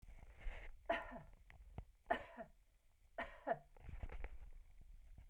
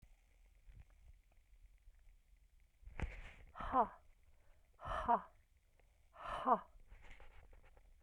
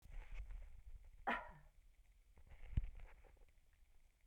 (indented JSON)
{
  "three_cough_length": "5.3 s",
  "three_cough_amplitude": 31139,
  "three_cough_signal_mean_std_ratio": 0.22,
  "exhalation_length": "8.0 s",
  "exhalation_amplitude": 3234,
  "exhalation_signal_mean_std_ratio": 0.34,
  "cough_length": "4.3 s",
  "cough_amplitude": 29322,
  "cough_signal_mean_std_ratio": 0.11,
  "survey_phase": "beta (2021-08-13 to 2022-03-07)",
  "age": "65+",
  "gender": "Female",
  "wearing_mask": "No",
  "symptom_runny_or_blocked_nose": true,
  "symptom_change_to_sense_of_smell_or_taste": true,
  "smoker_status": "Never smoked",
  "respiratory_condition_asthma": false,
  "respiratory_condition_other": false,
  "recruitment_source": "Test and Trace",
  "submission_delay": "2 days",
  "covid_test_result": "Positive",
  "covid_test_method": "LFT"
}